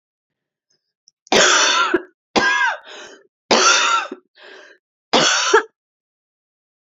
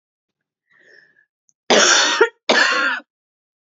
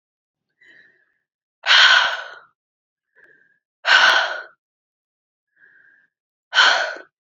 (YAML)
three_cough_length: 6.8 s
three_cough_amplitude: 30597
three_cough_signal_mean_std_ratio: 0.48
cough_length: 3.8 s
cough_amplitude: 29738
cough_signal_mean_std_ratio: 0.43
exhalation_length: 7.3 s
exhalation_amplitude: 30086
exhalation_signal_mean_std_ratio: 0.34
survey_phase: beta (2021-08-13 to 2022-03-07)
age: 18-44
gender: Female
wearing_mask: 'No'
symptom_cough_any: true
symptom_new_continuous_cough: true
symptom_runny_or_blocked_nose: true
symptom_fatigue: true
smoker_status: Never smoked
respiratory_condition_asthma: false
respiratory_condition_other: false
recruitment_source: Test and Trace
submission_delay: 1 day
covid_test_result: Positive
covid_test_method: RT-qPCR
covid_ct_value: 21.9
covid_ct_gene: ORF1ab gene
covid_ct_mean: 22.1
covid_viral_load: 54000 copies/ml
covid_viral_load_category: Low viral load (10K-1M copies/ml)